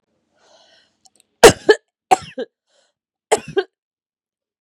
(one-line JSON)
{"three_cough_length": "4.6 s", "three_cough_amplitude": 32768, "three_cough_signal_mean_std_ratio": 0.2, "survey_phase": "beta (2021-08-13 to 2022-03-07)", "age": "45-64", "gender": "Female", "wearing_mask": "No", "symptom_cough_any": true, "symptom_runny_or_blocked_nose": true, "symptom_sore_throat": true, "symptom_fatigue": true, "symptom_headache": true, "symptom_change_to_sense_of_smell_or_taste": true, "symptom_loss_of_taste": true, "symptom_other": true, "smoker_status": "Ex-smoker", "respiratory_condition_asthma": false, "respiratory_condition_other": true, "recruitment_source": "Test and Trace", "submission_delay": "5 days", "covid_test_result": "Positive", "covid_test_method": "RT-qPCR", "covid_ct_value": 28.5, "covid_ct_gene": "ORF1ab gene", "covid_ct_mean": 28.8, "covid_viral_load": "360 copies/ml", "covid_viral_load_category": "Minimal viral load (< 10K copies/ml)"}